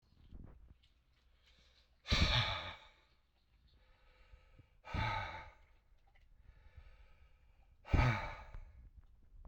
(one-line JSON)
{"exhalation_length": "9.5 s", "exhalation_amplitude": 3607, "exhalation_signal_mean_std_ratio": 0.35, "survey_phase": "alpha (2021-03-01 to 2021-08-12)", "age": "45-64", "gender": "Male", "wearing_mask": "No", "symptom_cough_any": true, "symptom_fever_high_temperature": true, "symptom_headache": true, "symptom_onset": "4 days", "smoker_status": "Ex-smoker", "respiratory_condition_asthma": false, "respiratory_condition_other": false, "recruitment_source": "Test and Trace", "submission_delay": "1 day", "covid_test_result": "Positive", "covid_test_method": "RT-qPCR", "covid_ct_value": 15.8, "covid_ct_gene": "ORF1ab gene", "covid_ct_mean": 16.4, "covid_viral_load": "4200000 copies/ml", "covid_viral_load_category": "High viral load (>1M copies/ml)"}